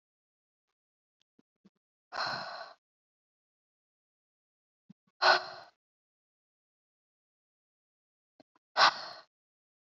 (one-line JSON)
{"exhalation_length": "9.9 s", "exhalation_amplitude": 11009, "exhalation_signal_mean_std_ratio": 0.19, "survey_phase": "beta (2021-08-13 to 2022-03-07)", "age": "18-44", "gender": "Female", "wearing_mask": "No", "symptom_cough_any": true, "symptom_headache": true, "symptom_other": true, "symptom_onset": "3 days", "smoker_status": "Never smoked", "respiratory_condition_asthma": false, "respiratory_condition_other": false, "recruitment_source": "Test and Trace", "submission_delay": "2 days", "covid_test_result": "Positive", "covid_test_method": "RT-qPCR", "covid_ct_value": 25.9, "covid_ct_gene": "N gene"}